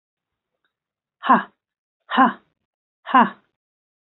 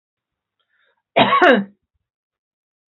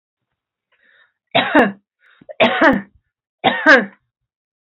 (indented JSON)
{
  "exhalation_length": "4.1 s",
  "exhalation_amplitude": 27499,
  "exhalation_signal_mean_std_ratio": 0.27,
  "cough_length": "3.0 s",
  "cough_amplitude": 31577,
  "cough_signal_mean_std_ratio": 0.31,
  "three_cough_length": "4.7 s",
  "three_cough_amplitude": 32768,
  "three_cough_signal_mean_std_ratio": 0.37,
  "survey_phase": "beta (2021-08-13 to 2022-03-07)",
  "age": "45-64",
  "gender": "Female",
  "wearing_mask": "No",
  "symptom_none": true,
  "smoker_status": "Current smoker (e-cigarettes or vapes only)",
  "respiratory_condition_asthma": false,
  "respiratory_condition_other": false,
  "recruitment_source": "REACT",
  "submission_delay": "2 days",
  "covid_test_result": "Negative",
  "covid_test_method": "RT-qPCR",
  "influenza_a_test_result": "Negative",
  "influenza_b_test_result": "Negative"
}